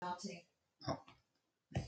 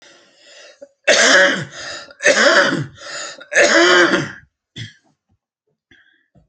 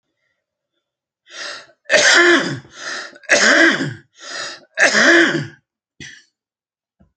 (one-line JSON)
{"exhalation_length": "1.9 s", "exhalation_amplitude": 1668, "exhalation_signal_mean_std_ratio": 0.46, "cough_length": "6.5 s", "cough_amplitude": 32768, "cough_signal_mean_std_ratio": 0.49, "three_cough_length": "7.2 s", "three_cough_amplitude": 32768, "three_cough_signal_mean_std_ratio": 0.46, "survey_phase": "alpha (2021-03-01 to 2021-08-12)", "age": "65+", "gender": "Male", "wearing_mask": "No", "symptom_cough_any": true, "smoker_status": "Ex-smoker", "respiratory_condition_asthma": false, "respiratory_condition_other": false, "recruitment_source": "REACT", "submission_delay": "2 days", "covid_test_result": "Negative", "covid_test_method": "RT-qPCR"}